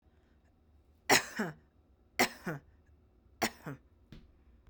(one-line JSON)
{"three_cough_length": "4.7 s", "three_cough_amplitude": 9193, "three_cough_signal_mean_std_ratio": 0.28, "survey_phase": "beta (2021-08-13 to 2022-03-07)", "age": "18-44", "gender": "Female", "wearing_mask": "Yes", "symptom_fatigue": true, "smoker_status": "Ex-smoker", "respiratory_condition_asthma": false, "respiratory_condition_other": false, "recruitment_source": "Test and Trace", "submission_delay": "3 days", "covid_test_result": "Positive", "covid_test_method": "RT-qPCR", "covid_ct_value": 22.2, "covid_ct_gene": "ORF1ab gene"}